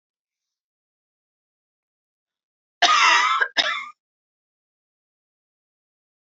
{"cough_length": "6.2 s", "cough_amplitude": 23971, "cough_signal_mean_std_ratio": 0.29, "survey_phase": "alpha (2021-03-01 to 2021-08-12)", "age": "45-64", "gender": "Female", "wearing_mask": "No", "symptom_none": true, "smoker_status": "Never smoked", "respiratory_condition_asthma": true, "respiratory_condition_other": false, "recruitment_source": "REACT", "submission_delay": "1 day", "covid_test_result": "Negative", "covid_test_method": "RT-qPCR"}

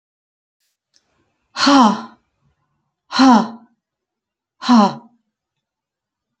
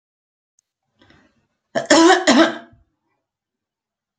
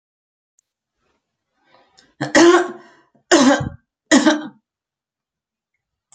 {"exhalation_length": "6.4 s", "exhalation_amplitude": 30354, "exhalation_signal_mean_std_ratio": 0.32, "cough_length": "4.2 s", "cough_amplitude": 32020, "cough_signal_mean_std_ratio": 0.31, "three_cough_length": "6.1 s", "three_cough_amplitude": 32767, "three_cough_signal_mean_std_ratio": 0.33, "survey_phase": "beta (2021-08-13 to 2022-03-07)", "age": "65+", "gender": "Female", "wearing_mask": "No", "symptom_none": true, "symptom_onset": "12 days", "smoker_status": "Never smoked", "respiratory_condition_asthma": false, "respiratory_condition_other": false, "recruitment_source": "REACT", "submission_delay": "1 day", "covid_test_result": "Negative", "covid_test_method": "RT-qPCR", "influenza_a_test_result": "Negative", "influenza_b_test_result": "Negative"}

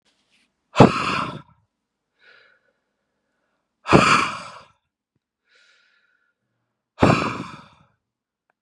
{"exhalation_length": "8.6 s", "exhalation_amplitude": 32768, "exhalation_signal_mean_std_ratio": 0.27, "survey_phase": "beta (2021-08-13 to 2022-03-07)", "age": "45-64", "gender": "Male", "wearing_mask": "No", "symptom_cough_any": true, "symptom_new_continuous_cough": true, "symptom_runny_or_blocked_nose": true, "symptom_headache": true, "smoker_status": "Never smoked", "respiratory_condition_asthma": false, "respiratory_condition_other": false, "recruitment_source": "Test and Trace", "submission_delay": "1 day", "covid_test_result": "Positive", "covid_test_method": "RT-qPCR", "covid_ct_value": 27.7, "covid_ct_gene": "N gene"}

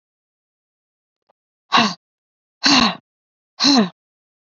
{"exhalation_length": "4.5 s", "exhalation_amplitude": 28357, "exhalation_signal_mean_std_ratio": 0.33, "survey_phase": "beta (2021-08-13 to 2022-03-07)", "age": "45-64", "gender": "Female", "wearing_mask": "No", "symptom_none": true, "smoker_status": "Never smoked", "respiratory_condition_asthma": false, "respiratory_condition_other": false, "recruitment_source": "REACT", "submission_delay": "3 days", "covid_test_result": "Negative", "covid_test_method": "RT-qPCR", "influenza_a_test_result": "Unknown/Void", "influenza_b_test_result": "Unknown/Void"}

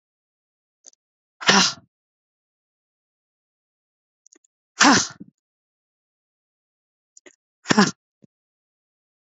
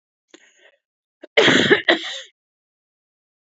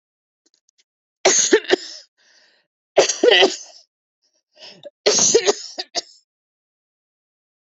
{"exhalation_length": "9.2 s", "exhalation_amplitude": 28170, "exhalation_signal_mean_std_ratio": 0.21, "cough_length": "3.6 s", "cough_amplitude": 28953, "cough_signal_mean_std_ratio": 0.32, "three_cough_length": "7.7 s", "three_cough_amplitude": 30963, "three_cough_signal_mean_std_ratio": 0.34, "survey_phase": "beta (2021-08-13 to 2022-03-07)", "age": "18-44", "gender": "Female", "wearing_mask": "No", "symptom_cough_any": true, "symptom_sore_throat": true, "symptom_headache": true, "symptom_change_to_sense_of_smell_or_taste": true, "smoker_status": "Ex-smoker", "respiratory_condition_asthma": false, "respiratory_condition_other": false, "recruitment_source": "Test and Trace", "submission_delay": "2 days", "covid_test_result": "Positive", "covid_test_method": "RT-qPCR"}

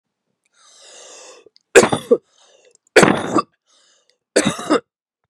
{"three_cough_length": "5.3 s", "three_cough_amplitude": 32768, "three_cough_signal_mean_std_ratio": 0.31, "survey_phase": "beta (2021-08-13 to 2022-03-07)", "age": "45-64", "gender": "Female", "wearing_mask": "No", "symptom_cough_any": true, "symptom_runny_or_blocked_nose": true, "symptom_fatigue": true, "symptom_fever_high_temperature": true, "symptom_headache": true, "symptom_onset": "2 days", "smoker_status": "Never smoked", "respiratory_condition_asthma": false, "respiratory_condition_other": false, "recruitment_source": "Test and Trace", "submission_delay": "2 days", "covid_test_result": "Positive", "covid_test_method": "RT-qPCR", "covid_ct_value": 25.9, "covid_ct_gene": "S gene", "covid_ct_mean": 26.3, "covid_viral_load": "2300 copies/ml", "covid_viral_load_category": "Minimal viral load (< 10K copies/ml)"}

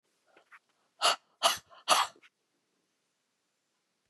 {"exhalation_length": "4.1 s", "exhalation_amplitude": 11703, "exhalation_signal_mean_std_ratio": 0.26, "survey_phase": "beta (2021-08-13 to 2022-03-07)", "age": "65+", "gender": "Female", "wearing_mask": "No", "symptom_shortness_of_breath": true, "smoker_status": "Ex-smoker", "respiratory_condition_asthma": false, "respiratory_condition_other": false, "recruitment_source": "REACT", "submission_delay": "1 day", "covid_test_result": "Negative", "covid_test_method": "RT-qPCR", "influenza_a_test_result": "Negative", "influenza_b_test_result": "Negative"}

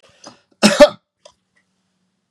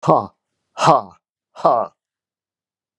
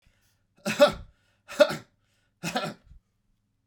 {"cough_length": "2.3 s", "cough_amplitude": 32768, "cough_signal_mean_std_ratio": 0.24, "exhalation_length": "3.0 s", "exhalation_amplitude": 32768, "exhalation_signal_mean_std_ratio": 0.34, "three_cough_length": "3.7 s", "three_cough_amplitude": 17158, "three_cough_signal_mean_std_ratio": 0.27, "survey_phase": "alpha (2021-03-01 to 2021-08-12)", "age": "65+", "gender": "Male", "wearing_mask": "No", "symptom_fatigue": true, "symptom_fever_high_temperature": true, "symptom_onset": "3 days", "smoker_status": "Never smoked", "respiratory_condition_asthma": false, "respiratory_condition_other": false, "recruitment_source": "Test and Trace", "submission_delay": "1 day", "covid_test_result": "Positive", "covid_test_method": "RT-qPCR"}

